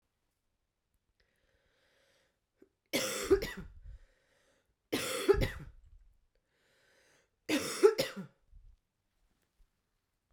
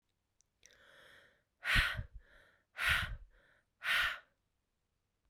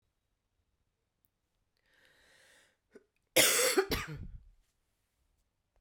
{"three_cough_length": "10.3 s", "three_cough_amplitude": 9257, "three_cough_signal_mean_std_ratio": 0.28, "exhalation_length": "5.3 s", "exhalation_amplitude": 5098, "exhalation_signal_mean_std_ratio": 0.37, "cough_length": "5.8 s", "cough_amplitude": 9381, "cough_signal_mean_std_ratio": 0.27, "survey_phase": "beta (2021-08-13 to 2022-03-07)", "age": "45-64", "gender": "Female", "wearing_mask": "No", "symptom_cough_any": true, "symptom_runny_or_blocked_nose": true, "symptom_fatigue": true, "symptom_fever_high_temperature": true, "symptom_headache": true, "symptom_change_to_sense_of_smell_or_taste": true, "symptom_other": true, "smoker_status": "Current smoker (e-cigarettes or vapes only)", "respiratory_condition_asthma": false, "respiratory_condition_other": false, "recruitment_source": "Test and Trace", "submission_delay": "2 days", "covid_test_result": "Positive", "covid_test_method": "RT-qPCR", "covid_ct_value": 19.2, "covid_ct_gene": "ORF1ab gene"}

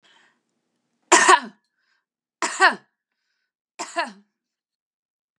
{"three_cough_length": "5.4 s", "three_cough_amplitude": 32305, "three_cough_signal_mean_std_ratio": 0.25, "survey_phase": "beta (2021-08-13 to 2022-03-07)", "age": "65+", "gender": "Female", "wearing_mask": "No", "symptom_runny_or_blocked_nose": true, "symptom_onset": "7 days", "smoker_status": "Ex-smoker", "respiratory_condition_asthma": false, "respiratory_condition_other": false, "recruitment_source": "REACT", "submission_delay": "3 days", "covid_test_result": "Negative", "covid_test_method": "RT-qPCR", "influenza_a_test_result": "Negative", "influenza_b_test_result": "Negative"}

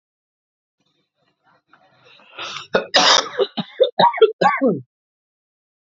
{"cough_length": "5.8 s", "cough_amplitude": 29579, "cough_signal_mean_std_ratio": 0.37, "survey_phase": "alpha (2021-03-01 to 2021-08-12)", "age": "18-44", "gender": "Male", "wearing_mask": "No", "symptom_cough_any": true, "symptom_new_continuous_cough": true, "symptom_fatigue": true, "symptom_onset": "4 days", "smoker_status": "Never smoked", "respiratory_condition_asthma": true, "respiratory_condition_other": false, "recruitment_source": "Test and Trace", "submission_delay": "2 days", "covid_test_result": "Positive", "covid_test_method": "RT-qPCR", "covid_ct_value": 32.1, "covid_ct_gene": "N gene", "covid_ct_mean": 32.1, "covid_viral_load": "31 copies/ml", "covid_viral_load_category": "Minimal viral load (< 10K copies/ml)"}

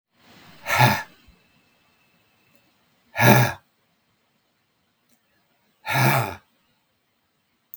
{"exhalation_length": "7.8 s", "exhalation_amplitude": 32766, "exhalation_signal_mean_std_ratio": 0.29, "survey_phase": "beta (2021-08-13 to 2022-03-07)", "age": "65+", "gender": "Male", "wearing_mask": "No", "symptom_cough_any": true, "symptom_shortness_of_breath": true, "symptom_onset": "8 days", "smoker_status": "Ex-smoker", "respiratory_condition_asthma": false, "respiratory_condition_other": true, "recruitment_source": "REACT", "submission_delay": "2 days", "covid_test_result": "Negative", "covid_test_method": "RT-qPCR", "influenza_a_test_result": "Negative", "influenza_b_test_result": "Negative"}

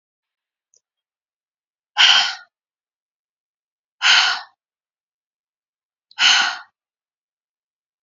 {"exhalation_length": "8.0 s", "exhalation_amplitude": 29996, "exhalation_signal_mean_std_ratio": 0.28, "survey_phase": "beta (2021-08-13 to 2022-03-07)", "age": "45-64", "gender": "Female", "wearing_mask": "No", "symptom_cough_any": true, "symptom_runny_or_blocked_nose": true, "symptom_fatigue": true, "symptom_headache": true, "symptom_change_to_sense_of_smell_or_taste": true, "symptom_other": true, "symptom_onset": "12 days", "smoker_status": "Never smoked", "respiratory_condition_asthma": false, "respiratory_condition_other": false, "recruitment_source": "REACT", "submission_delay": "0 days", "covid_test_result": "Positive", "covid_test_method": "RT-qPCR", "covid_ct_value": 26.0, "covid_ct_gene": "E gene", "influenza_a_test_result": "Negative", "influenza_b_test_result": "Negative"}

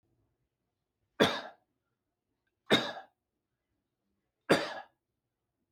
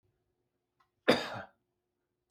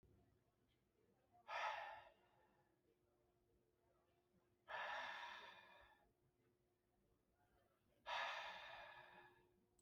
{"three_cough_length": "5.7 s", "three_cough_amplitude": 12127, "three_cough_signal_mean_std_ratio": 0.23, "cough_length": "2.3 s", "cough_amplitude": 12251, "cough_signal_mean_std_ratio": 0.22, "exhalation_length": "9.8 s", "exhalation_amplitude": 556, "exhalation_signal_mean_std_ratio": 0.43, "survey_phase": "beta (2021-08-13 to 2022-03-07)", "age": "18-44", "gender": "Male", "wearing_mask": "No", "symptom_none": true, "smoker_status": "Never smoked", "respiratory_condition_asthma": false, "respiratory_condition_other": false, "recruitment_source": "REACT", "submission_delay": "1 day", "covid_test_result": "Negative", "covid_test_method": "RT-qPCR", "influenza_a_test_result": "Negative", "influenza_b_test_result": "Negative"}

